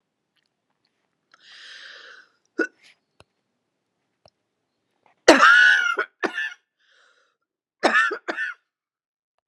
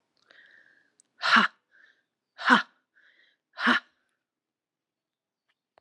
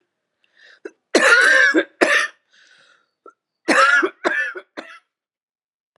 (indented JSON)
{
  "three_cough_length": "9.5 s",
  "three_cough_amplitude": 32768,
  "three_cough_signal_mean_std_ratio": 0.29,
  "exhalation_length": "5.8 s",
  "exhalation_amplitude": 21854,
  "exhalation_signal_mean_std_ratio": 0.25,
  "cough_length": "6.0 s",
  "cough_amplitude": 32374,
  "cough_signal_mean_std_ratio": 0.44,
  "survey_phase": "beta (2021-08-13 to 2022-03-07)",
  "age": "45-64",
  "gender": "Female",
  "wearing_mask": "No",
  "symptom_cough_any": true,
  "symptom_shortness_of_breath": true,
  "smoker_status": "Ex-smoker",
  "respiratory_condition_asthma": true,
  "respiratory_condition_other": false,
  "recruitment_source": "REACT",
  "submission_delay": "1 day",
  "covid_test_result": "Negative",
  "covid_test_method": "RT-qPCR",
  "influenza_a_test_result": "Negative",
  "influenza_b_test_result": "Negative"
}